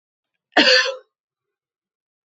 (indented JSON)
{
  "cough_length": "2.4 s",
  "cough_amplitude": 30509,
  "cough_signal_mean_std_ratio": 0.3,
  "survey_phase": "beta (2021-08-13 to 2022-03-07)",
  "age": "65+",
  "gender": "Female",
  "wearing_mask": "No",
  "symptom_none": true,
  "smoker_status": "Ex-smoker",
  "respiratory_condition_asthma": false,
  "respiratory_condition_other": false,
  "recruitment_source": "REACT",
  "submission_delay": "1 day",
  "covid_test_result": "Negative",
  "covid_test_method": "RT-qPCR",
  "influenza_a_test_result": "Negative",
  "influenza_b_test_result": "Negative"
}